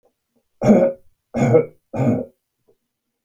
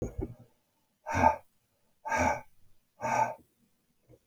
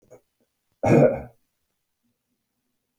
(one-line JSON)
{"three_cough_length": "3.2 s", "three_cough_amplitude": 27543, "three_cough_signal_mean_std_ratio": 0.42, "exhalation_length": "4.3 s", "exhalation_amplitude": 11137, "exhalation_signal_mean_std_ratio": 0.39, "cough_length": "3.0 s", "cough_amplitude": 18732, "cough_signal_mean_std_ratio": 0.27, "survey_phase": "beta (2021-08-13 to 2022-03-07)", "age": "45-64", "gender": "Male", "wearing_mask": "No", "symptom_none": true, "smoker_status": "Never smoked", "respiratory_condition_asthma": false, "respiratory_condition_other": false, "recruitment_source": "REACT", "submission_delay": "6 days", "covid_test_result": "Negative", "covid_test_method": "RT-qPCR"}